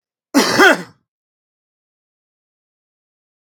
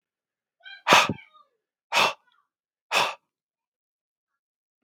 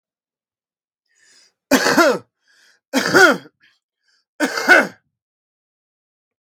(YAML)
cough_length: 3.4 s
cough_amplitude: 32768
cough_signal_mean_std_ratio: 0.27
exhalation_length: 4.8 s
exhalation_amplitude: 32727
exhalation_signal_mean_std_ratio: 0.27
three_cough_length: 6.4 s
three_cough_amplitude: 32768
three_cough_signal_mean_std_ratio: 0.34
survey_phase: beta (2021-08-13 to 2022-03-07)
age: 45-64
gender: Male
wearing_mask: 'No'
symptom_none: true
smoker_status: Current smoker (1 to 10 cigarettes per day)
respiratory_condition_asthma: false
respiratory_condition_other: false
recruitment_source: REACT
submission_delay: 1 day
covid_test_result: Negative
covid_test_method: RT-qPCR
influenza_a_test_result: Negative
influenza_b_test_result: Negative